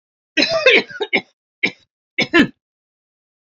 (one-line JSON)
{"three_cough_length": "3.6 s", "three_cough_amplitude": 30802, "three_cough_signal_mean_std_ratio": 0.37, "survey_phase": "alpha (2021-03-01 to 2021-08-12)", "age": "65+", "gender": "Female", "wearing_mask": "No", "symptom_none": true, "smoker_status": "Ex-smoker", "respiratory_condition_asthma": false, "respiratory_condition_other": false, "recruitment_source": "REACT", "submission_delay": "1 day", "covid_test_result": "Negative", "covid_test_method": "RT-qPCR"}